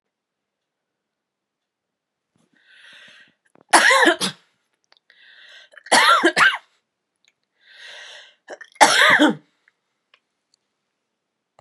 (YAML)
three_cough_length: 11.6 s
three_cough_amplitude: 32768
three_cough_signal_mean_std_ratio: 0.31
survey_phase: beta (2021-08-13 to 2022-03-07)
age: 45-64
gender: Female
wearing_mask: 'No'
symptom_cough_any: true
symptom_onset: 30 days
smoker_status: Never smoked
respiratory_condition_asthma: false
respiratory_condition_other: false
recruitment_source: Test and Trace
submission_delay: 1 day
covid_test_result: Negative
covid_test_method: RT-qPCR